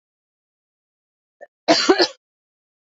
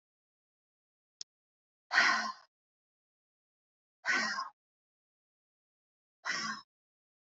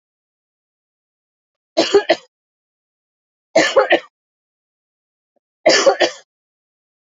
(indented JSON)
{
  "cough_length": "3.0 s",
  "cough_amplitude": 27363,
  "cough_signal_mean_std_ratio": 0.26,
  "exhalation_length": "7.3 s",
  "exhalation_amplitude": 8414,
  "exhalation_signal_mean_std_ratio": 0.29,
  "three_cough_length": "7.1 s",
  "three_cough_amplitude": 32767,
  "three_cough_signal_mean_std_ratio": 0.3,
  "survey_phase": "beta (2021-08-13 to 2022-03-07)",
  "age": "45-64",
  "gender": "Female",
  "wearing_mask": "No",
  "symptom_fatigue": true,
  "smoker_status": "Never smoked",
  "respiratory_condition_asthma": false,
  "respiratory_condition_other": false,
  "recruitment_source": "REACT",
  "submission_delay": "1 day",
  "covid_test_result": "Negative",
  "covid_test_method": "RT-qPCR"
}